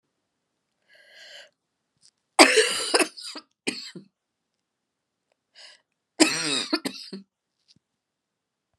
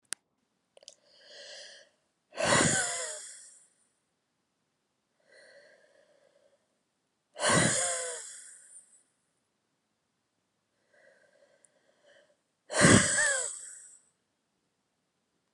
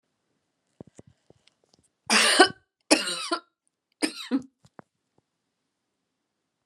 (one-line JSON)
{"cough_length": "8.8 s", "cough_amplitude": 32737, "cough_signal_mean_std_ratio": 0.26, "exhalation_length": "15.5 s", "exhalation_amplitude": 14674, "exhalation_signal_mean_std_ratio": 0.3, "three_cough_length": "6.7 s", "three_cough_amplitude": 28075, "three_cough_signal_mean_std_ratio": 0.27, "survey_phase": "beta (2021-08-13 to 2022-03-07)", "age": "45-64", "gender": "Female", "wearing_mask": "No", "symptom_cough_any": true, "symptom_runny_or_blocked_nose": true, "symptom_sore_throat": true, "symptom_fatigue": true, "symptom_fever_high_temperature": true, "symptom_headache": true, "symptom_change_to_sense_of_smell_or_taste": true, "symptom_onset": "3 days", "smoker_status": "Never smoked", "respiratory_condition_asthma": false, "respiratory_condition_other": false, "recruitment_source": "Test and Trace", "submission_delay": "2 days", "covid_test_result": "Positive", "covid_test_method": "RT-qPCR", "covid_ct_value": 17.1, "covid_ct_gene": "ORF1ab gene", "covid_ct_mean": 17.7, "covid_viral_load": "1500000 copies/ml", "covid_viral_load_category": "High viral load (>1M copies/ml)"}